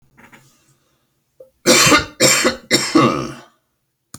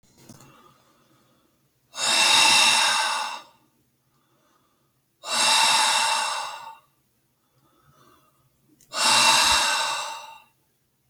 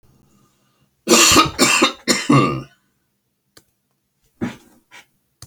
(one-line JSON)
{"three_cough_length": "4.2 s", "three_cough_amplitude": 32767, "three_cough_signal_mean_std_ratio": 0.44, "exhalation_length": "11.1 s", "exhalation_amplitude": 18415, "exhalation_signal_mean_std_ratio": 0.5, "cough_length": "5.5 s", "cough_amplitude": 32768, "cough_signal_mean_std_ratio": 0.39, "survey_phase": "beta (2021-08-13 to 2022-03-07)", "age": "65+", "gender": "Male", "wearing_mask": "No", "symptom_none": true, "smoker_status": "Never smoked", "respiratory_condition_asthma": false, "respiratory_condition_other": false, "recruitment_source": "REACT", "submission_delay": "14 days", "covid_test_result": "Negative", "covid_test_method": "RT-qPCR"}